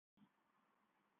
cough_length: 1.2 s
cough_amplitude: 30
cough_signal_mean_std_ratio: 0.69
survey_phase: beta (2021-08-13 to 2022-03-07)
age: 45-64
gender: Female
wearing_mask: 'Yes'
symptom_none: true
smoker_status: Never smoked
respiratory_condition_asthma: false
respiratory_condition_other: false
recruitment_source: REACT
submission_delay: 3 days
covid_test_result: Negative
covid_test_method: RT-qPCR
influenza_a_test_result: Negative
influenza_b_test_result: Negative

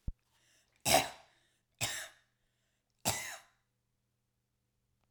three_cough_length: 5.1 s
three_cough_amplitude: 6811
three_cough_signal_mean_std_ratio: 0.26
survey_phase: alpha (2021-03-01 to 2021-08-12)
age: 18-44
gender: Female
wearing_mask: 'No'
symptom_none: true
symptom_onset: 12 days
smoker_status: Never smoked
respiratory_condition_asthma: false
respiratory_condition_other: false
recruitment_source: REACT
submission_delay: 2 days
covid_test_result: Negative
covid_test_method: RT-qPCR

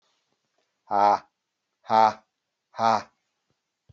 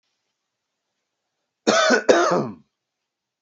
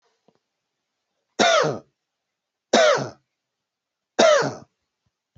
exhalation_length: 3.9 s
exhalation_amplitude: 16663
exhalation_signal_mean_std_ratio: 0.31
cough_length: 3.4 s
cough_amplitude: 27320
cough_signal_mean_std_ratio: 0.37
three_cough_length: 5.4 s
three_cough_amplitude: 24189
three_cough_signal_mean_std_ratio: 0.35
survey_phase: beta (2021-08-13 to 2022-03-07)
age: 45-64
gender: Male
wearing_mask: 'No'
symptom_none: true
smoker_status: Never smoked
respiratory_condition_asthma: false
respiratory_condition_other: false
recruitment_source: REACT
submission_delay: 2 days
covid_test_result: Negative
covid_test_method: RT-qPCR
influenza_a_test_result: Negative
influenza_b_test_result: Negative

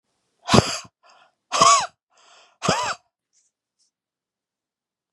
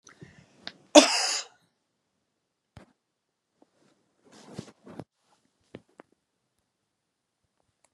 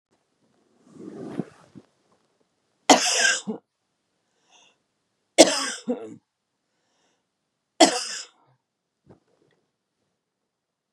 exhalation_length: 5.1 s
exhalation_amplitude: 32768
exhalation_signal_mean_std_ratio: 0.3
cough_length: 7.9 s
cough_amplitude: 32767
cough_signal_mean_std_ratio: 0.15
three_cough_length: 10.9 s
three_cough_amplitude: 32768
three_cough_signal_mean_std_ratio: 0.23
survey_phase: beta (2021-08-13 to 2022-03-07)
age: 65+
gender: Female
wearing_mask: 'No'
symptom_fatigue: true
symptom_other: true
symptom_onset: 12 days
smoker_status: Never smoked
respiratory_condition_asthma: false
respiratory_condition_other: true
recruitment_source: REACT
submission_delay: 2 days
covid_test_result: Positive
covid_test_method: RT-qPCR
covid_ct_value: 33.5
covid_ct_gene: E gene
influenza_a_test_result: Negative
influenza_b_test_result: Negative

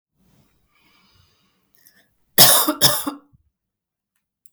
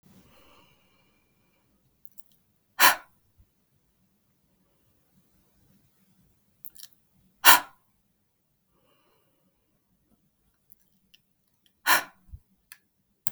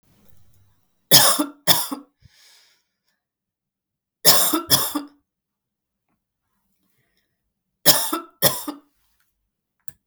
cough_length: 4.5 s
cough_amplitude: 32768
cough_signal_mean_std_ratio: 0.27
exhalation_length: 13.3 s
exhalation_amplitude: 32768
exhalation_signal_mean_std_ratio: 0.15
three_cough_length: 10.1 s
three_cough_amplitude: 32768
three_cough_signal_mean_std_ratio: 0.3
survey_phase: beta (2021-08-13 to 2022-03-07)
age: 18-44
gender: Female
wearing_mask: 'No'
symptom_none: true
symptom_onset: 6 days
smoker_status: Never smoked
respiratory_condition_asthma: false
respiratory_condition_other: false
recruitment_source: REACT
submission_delay: 2 days
covid_test_result: Negative
covid_test_method: RT-qPCR
influenza_a_test_result: Unknown/Void
influenza_b_test_result: Unknown/Void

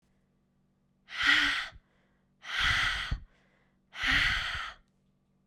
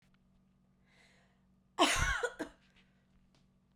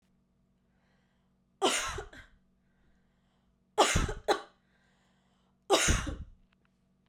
exhalation_length: 5.5 s
exhalation_amplitude: 8692
exhalation_signal_mean_std_ratio: 0.49
cough_length: 3.8 s
cough_amplitude: 5929
cough_signal_mean_std_ratio: 0.31
three_cough_length: 7.1 s
three_cough_amplitude: 10421
three_cough_signal_mean_std_ratio: 0.33
survey_phase: beta (2021-08-13 to 2022-03-07)
age: 18-44
gender: Female
wearing_mask: 'No'
symptom_none: true
smoker_status: Never smoked
respiratory_condition_asthma: false
respiratory_condition_other: false
recruitment_source: REACT
submission_delay: 2 days
covid_test_result: Negative
covid_test_method: RT-qPCR
influenza_a_test_result: Unknown/Void
influenza_b_test_result: Unknown/Void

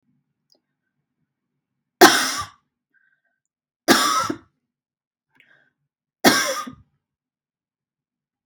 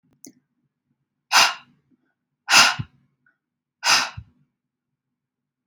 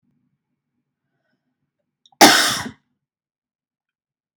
three_cough_length: 8.5 s
three_cough_amplitude: 32768
three_cough_signal_mean_std_ratio: 0.25
exhalation_length: 5.7 s
exhalation_amplitude: 32490
exhalation_signal_mean_std_ratio: 0.27
cough_length: 4.4 s
cough_amplitude: 32768
cough_signal_mean_std_ratio: 0.22
survey_phase: beta (2021-08-13 to 2022-03-07)
age: 18-44
gender: Female
wearing_mask: 'No'
symptom_runny_or_blocked_nose: true
symptom_onset: 12 days
smoker_status: Never smoked
respiratory_condition_asthma: false
respiratory_condition_other: false
recruitment_source: REACT
submission_delay: 2 days
covid_test_result: Negative
covid_test_method: RT-qPCR
influenza_a_test_result: Negative
influenza_b_test_result: Negative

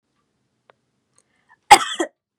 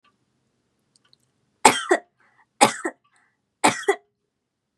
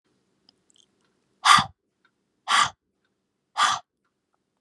cough_length: 2.4 s
cough_amplitude: 32768
cough_signal_mean_std_ratio: 0.18
three_cough_length: 4.8 s
three_cough_amplitude: 32768
three_cough_signal_mean_std_ratio: 0.24
exhalation_length: 4.6 s
exhalation_amplitude: 28499
exhalation_signal_mean_std_ratio: 0.27
survey_phase: beta (2021-08-13 to 2022-03-07)
age: 18-44
gender: Female
wearing_mask: 'No'
symptom_none: true
smoker_status: Never smoked
respiratory_condition_asthma: false
respiratory_condition_other: false
recruitment_source: REACT
submission_delay: 3 days
covid_test_result: Negative
covid_test_method: RT-qPCR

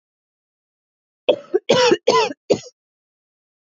cough_length: 3.8 s
cough_amplitude: 27183
cough_signal_mean_std_ratio: 0.34
survey_phase: beta (2021-08-13 to 2022-03-07)
age: 18-44
gender: Female
wearing_mask: 'No'
symptom_new_continuous_cough: true
symptom_runny_or_blocked_nose: true
symptom_headache: true
symptom_onset: 2 days
smoker_status: Ex-smoker
respiratory_condition_asthma: false
respiratory_condition_other: false
recruitment_source: Test and Trace
submission_delay: 2 days
covid_test_result: Positive
covid_test_method: RT-qPCR
covid_ct_value: 22.6
covid_ct_gene: N gene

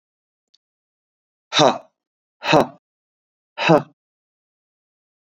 exhalation_length: 5.2 s
exhalation_amplitude: 28160
exhalation_signal_mean_std_ratio: 0.26
survey_phase: beta (2021-08-13 to 2022-03-07)
age: 18-44
gender: Male
wearing_mask: 'No'
symptom_none: true
smoker_status: Never smoked
respiratory_condition_asthma: false
respiratory_condition_other: false
recruitment_source: REACT
submission_delay: 2 days
covid_test_result: Negative
covid_test_method: RT-qPCR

